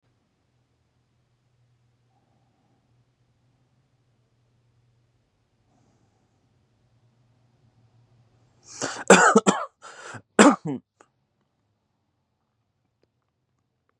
{
  "cough_length": "14.0 s",
  "cough_amplitude": 32708,
  "cough_signal_mean_std_ratio": 0.17,
  "survey_phase": "beta (2021-08-13 to 2022-03-07)",
  "age": "18-44",
  "gender": "Male",
  "wearing_mask": "No",
  "symptom_none": true,
  "smoker_status": "Current smoker (1 to 10 cigarettes per day)",
  "respiratory_condition_asthma": false,
  "respiratory_condition_other": false,
  "recruitment_source": "REACT",
  "submission_delay": "3 days",
  "covid_test_result": "Negative",
  "covid_test_method": "RT-qPCR",
  "influenza_a_test_result": "Negative",
  "influenza_b_test_result": "Negative"
}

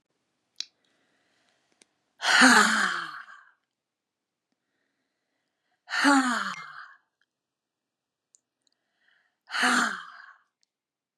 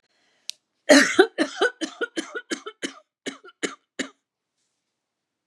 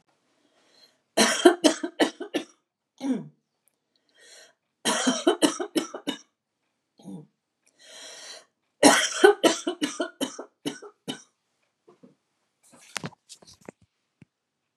{
  "exhalation_length": "11.2 s",
  "exhalation_amplitude": 20228,
  "exhalation_signal_mean_std_ratio": 0.31,
  "cough_length": "5.5 s",
  "cough_amplitude": 30307,
  "cough_signal_mean_std_ratio": 0.29,
  "three_cough_length": "14.8 s",
  "three_cough_amplitude": 30906,
  "three_cough_signal_mean_std_ratio": 0.31,
  "survey_phase": "beta (2021-08-13 to 2022-03-07)",
  "age": "65+",
  "gender": "Female",
  "wearing_mask": "No",
  "symptom_none": true,
  "smoker_status": "Ex-smoker",
  "respiratory_condition_asthma": false,
  "respiratory_condition_other": false,
  "recruitment_source": "REACT",
  "submission_delay": "1 day",
  "covid_test_result": "Negative",
  "covid_test_method": "RT-qPCR",
  "influenza_a_test_result": "Negative",
  "influenza_b_test_result": "Negative"
}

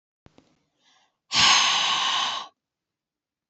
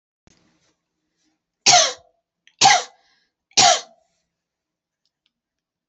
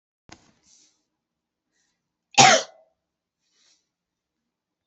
{
  "exhalation_length": "3.5 s",
  "exhalation_amplitude": 19879,
  "exhalation_signal_mean_std_ratio": 0.45,
  "three_cough_length": "5.9 s",
  "three_cough_amplitude": 32767,
  "three_cough_signal_mean_std_ratio": 0.27,
  "cough_length": "4.9 s",
  "cough_amplitude": 32767,
  "cough_signal_mean_std_ratio": 0.17,
  "survey_phase": "beta (2021-08-13 to 2022-03-07)",
  "age": "45-64",
  "gender": "Female",
  "wearing_mask": "No",
  "symptom_none": true,
  "smoker_status": "Ex-smoker",
  "respiratory_condition_asthma": false,
  "respiratory_condition_other": false,
  "recruitment_source": "REACT",
  "submission_delay": "2 days",
  "covid_test_result": "Negative",
  "covid_test_method": "RT-qPCR",
  "influenza_a_test_result": "Negative",
  "influenza_b_test_result": "Negative"
}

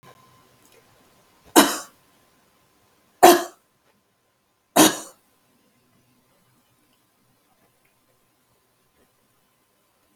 {
  "three_cough_length": "10.2 s",
  "three_cough_amplitude": 32768,
  "three_cough_signal_mean_std_ratio": 0.18,
  "survey_phase": "alpha (2021-03-01 to 2021-08-12)",
  "age": "65+",
  "gender": "Female",
  "wearing_mask": "No",
  "symptom_change_to_sense_of_smell_or_taste": true,
  "symptom_loss_of_taste": true,
  "symptom_onset": "12 days",
  "smoker_status": "Ex-smoker",
  "respiratory_condition_asthma": false,
  "respiratory_condition_other": false,
  "recruitment_source": "REACT",
  "submission_delay": "2 days",
  "covid_test_result": "Negative",
  "covid_test_method": "RT-qPCR"
}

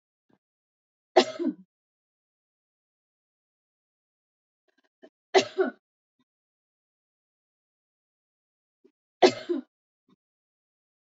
{
  "three_cough_length": "11.0 s",
  "three_cough_amplitude": 20752,
  "three_cough_signal_mean_std_ratio": 0.17,
  "survey_phase": "beta (2021-08-13 to 2022-03-07)",
  "age": "45-64",
  "gender": "Female",
  "wearing_mask": "No",
  "symptom_cough_any": true,
  "symptom_other": true,
  "smoker_status": "Never smoked",
  "respiratory_condition_asthma": false,
  "respiratory_condition_other": false,
  "recruitment_source": "Test and Trace",
  "submission_delay": "2 days",
  "covid_test_result": "Positive",
  "covid_test_method": "RT-qPCR",
  "covid_ct_value": 27.7,
  "covid_ct_gene": "ORF1ab gene",
  "covid_ct_mean": 28.2,
  "covid_viral_load": "560 copies/ml",
  "covid_viral_load_category": "Minimal viral load (< 10K copies/ml)"
}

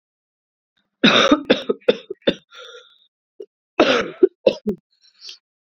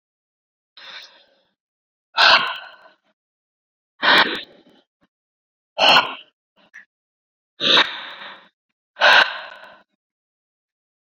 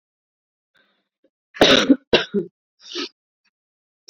{
  "three_cough_length": "5.6 s",
  "three_cough_amplitude": 32141,
  "three_cough_signal_mean_std_ratio": 0.34,
  "exhalation_length": "11.1 s",
  "exhalation_amplitude": 30094,
  "exhalation_signal_mean_std_ratio": 0.31,
  "cough_length": "4.1 s",
  "cough_amplitude": 29286,
  "cough_signal_mean_std_ratio": 0.28,
  "survey_phase": "beta (2021-08-13 to 2022-03-07)",
  "age": "18-44",
  "gender": "Female",
  "wearing_mask": "No",
  "symptom_cough_any": true,
  "symptom_runny_or_blocked_nose": true,
  "symptom_shortness_of_breath": true,
  "symptom_fatigue": true,
  "symptom_fever_high_temperature": true,
  "symptom_headache": true,
  "symptom_change_to_sense_of_smell_or_taste": true,
  "symptom_loss_of_taste": true,
  "symptom_other": true,
  "symptom_onset": "3 days",
  "smoker_status": "Ex-smoker",
  "respiratory_condition_asthma": false,
  "respiratory_condition_other": false,
  "recruitment_source": "Test and Trace",
  "submission_delay": "1 day",
  "covid_test_method": "RT-qPCR",
  "covid_ct_value": 37.6,
  "covid_ct_gene": "N gene"
}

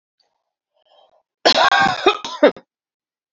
{
  "cough_length": "3.3 s",
  "cough_amplitude": 27832,
  "cough_signal_mean_std_ratio": 0.37,
  "survey_phase": "beta (2021-08-13 to 2022-03-07)",
  "age": "45-64",
  "gender": "Female",
  "wearing_mask": "No",
  "symptom_cough_any": true,
  "symptom_runny_or_blocked_nose": true,
  "symptom_shortness_of_breath": true,
  "symptom_sore_throat": true,
  "symptom_fatigue": true,
  "symptom_onset": "2 days",
  "smoker_status": "Never smoked",
  "respiratory_condition_asthma": false,
  "respiratory_condition_other": false,
  "recruitment_source": "Test and Trace",
  "submission_delay": "2 days",
  "covid_test_result": "Positive",
  "covid_test_method": "RT-qPCR",
  "covid_ct_value": 25.2,
  "covid_ct_gene": "ORF1ab gene",
  "covid_ct_mean": 25.7,
  "covid_viral_load": "3600 copies/ml",
  "covid_viral_load_category": "Minimal viral load (< 10K copies/ml)"
}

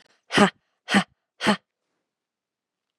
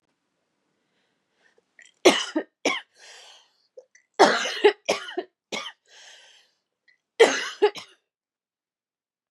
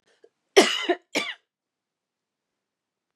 {
  "exhalation_length": "3.0 s",
  "exhalation_amplitude": 29101,
  "exhalation_signal_mean_std_ratio": 0.27,
  "three_cough_length": "9.3 s",
  "three_cough_amplitude": 28689,
  "three_cough_signal_mean_std_ratio": 0.27,
  "cough_length": "3.2 s",
  "cough_amplitude": 27481,
  "cough_signal_mean_std_ratio": 0.25,
  "survey_phase": "beta (2021-08-13 to 2022-03-07)",
  "age": "45-64",
  "gender": "Female",
  "wearing_mask": "No",
  "symptom_cough_any": true,
  "symptom_new_continuous_cough": true,
  "symptom_runny_or_blocked_nose": true,
  "symptom_headache": true,
  "smoker_status": "Never smoked",
  "respiratory_condition_asthma": false,
  "respiratory_condition_other": false,
  "recruitment_source": "Test and Trace",
  "submission_delay": "2 days",
  "covid_test_result": "Positive",
  "covid_test_method": "LFT"
}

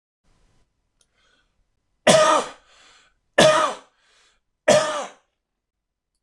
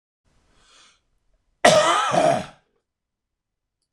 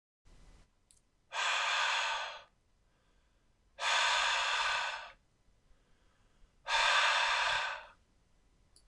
{
  "three_cough_length": "6.2 s",
  "three_cough_amplitude": 26027,
  "three_cough_signal_mean_std_ratio": 0.33,
  "cough_length": "3.9 s",
  "cough_amplitude": 26028,
  "cough_signal_mean_std_ratio": 0.35,
  "exhalation_length": "8.9 s",
  "exhalation_amplitude": 4660,
  "exhalation_signal_mean_std_ratio": 0.55,
  "survey_phase": "beta (2021-08-13 to 2022-03-07)",
  "age": "45-64",
  "gender": "Male",
  "wearing_mask": "No",
  "symptom_none": true,
  "smoker_status": "Never smoked",
  "respiratory_condition_asthma": false,
  "respiratory_condition_other": false,
  "recruitment_source": "REACT",
  "submission_delay": "0 days",
  "covid_test_result": "Negative",
  "covid_test_method": "RT-qPCR"
}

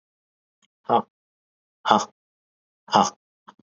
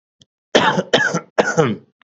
{
  "exhalation_length": "3.7 s",
  "exhalation_amplitude": 32768,
  "exhalation_signal_mean_std_ratio": 0.25,
  "cough_length": "2.0 s",
  "cough_amplitude": 28355,
  "cough_signal_mean_std_ratio": 0.53,
  "survey_phase": "beta (2021-08-13 to 2022-03-07)",
  "age": "18-44",
  "gender": "Male",
  "wearing_mask": "Yes",
  "symptom_none": true,
  "smoker_status": "Never smoked",
  "respiratory_condition_asthma": true,
  "respiratory_condition_other": false,
  "recruitment_source": "REACT",
  "submission_delay": "1 day",
  "covid_test_result": "Negative",
  "covid_test_method": "RT-qPCR",
  "influenza_a_test_result": "Unknown/Void",
  "influenza_b_test_result": "Unknown/Void"
}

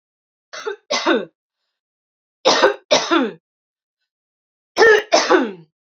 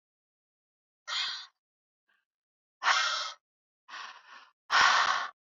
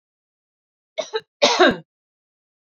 {
  "three_cough_length": "6.0 s",
  "three_cough_amplitude": 30654,
  "three_cough_signal_mean_std_ratio": 0.41,
  "exhalation_length": "5.5 s",
  "exhalation_amplitude": 10563,
  "exhalation_signal_mean_std_ratio": 0.38,
  "cough_length": "2.6 s",
  "cough_amplitude": 27139,
  "cough_signal_mean_std_ratio": 0.3,
  "survey_phase": "beta (2021-08-13 to 2022-03-07)",
  "age": "18-44",
  "gender": "Female",
  "wearing_mask": "No",
  "symptom_cough_any": true,
  "symptom_runny_or_blocked_nose": true,
  "symptom_onset": "2 days",
  "smoker_status": "Never smoked",
  "respiratory_condition_asthma": false,
  "respiratory_condition_other": false,
  "recruitment_source": "Test and Trace",
  "submission_delay": "2 days",
  "covid_test_result": "Positive",
  "covid_test_method": "RT-qPCR",
  "covid_ct_value": 23.0,
  "covid_ct_gene": "S gene"
}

